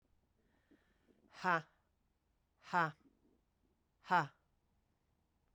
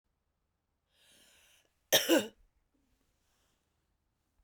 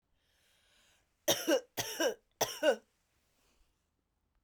{
  "exhalation_length": "5.5 s",
  "exhalation_amplitude": 3612,
  "exhalation_signal_mean_std_ratio": 0.24,
  "cough_length": "4.4 s",
  "cough_amplitude": 11147,
  "cough_signal_mean_std_ratio": 0.2,
  "three_cough_length": "4.4 s",
  "three_cough_amplitude": 5514,
  "three_cough_signal_mean_std_ratio": 0.33,
  "survey_phase": "beta (2021-08-13 to 2022-03-07)",
  "age": "45-64",
  "gender": "Female",
  "wearing_mask": "No",
  "symptom_cough_any": true,
  "symptom_runny_or_blocked_nose": true,
  "symptom_fatigue": true,
  "symptom_headache": true,
  "symptom_onset": "3 days",
  "smoker_status": "Never smoked",
  "respiratory_condition_asthma": true,
  "respiratory_condition_other": false,
  "recruitment_source": "Test and Trace",
  "submission_delay": "2 days",
  "covid_test_result": "Positive",
  "covid_test_method": "RT-qPCR"
}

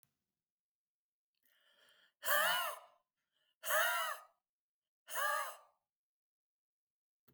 {
  "exhalation_length": "7.3 s",
  "exhalation_amplitude": 3693,
  "exhalation_signal_mean_std_ratio": 0.36,
  "survey_phase": "alpha (2021-03-01 to 2021-08-12)",
  "age": "45-64",
  "gender": "Female",
  "wearing_mask": "No",
  "symptom_none": true,
  "smoker_status": "Ex-smoker",
  "respiratory_condition_asthma": false,
  "respiratory_condition_other": false,
  "recruitment_source": "REACT",
  "submission_delay": "3 days",
  "covid_test_result": "Negative",
  "covid_test_method": "RT-qPCR"
}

